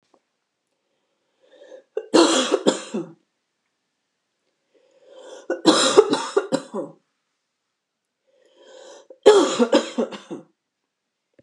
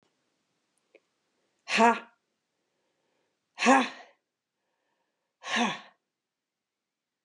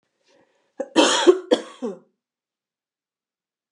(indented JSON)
{
  "three_cough_length": "11.4 s",
  "three_cough_amplitude": 32733,
  "three_cough_signal_mean_std_ratio": 0.33,
  "exhalation_length": "7.2 s",
  "exhalation_amplitude": 14162,
  "exhalation_signal_mean_std_ratio": 0.25,
  "cough_length": "3.7 s",
  "cough_amplitude": 29883,
  "cough_signal_mean_std_ratio": 0.29,
  "survey_phase": "beta (2021-08-13 to 2022-03-07)",
  "age": "45-64",
  "gender": "Female",
  "wearing_mask": "No",
  "symptom_change_to_sense_of_smell_or_taste": true,
  "smoker_status": "Never smoked",
  "respiratory_condition_asthma": true,
  "respiratory_condition_other": false,
  "recruitment_source": "REACT",
  "submission_delay": "1 day",
  "covid_test_result": "Negative",
  "covid_test_method": "RT-qPCR"
}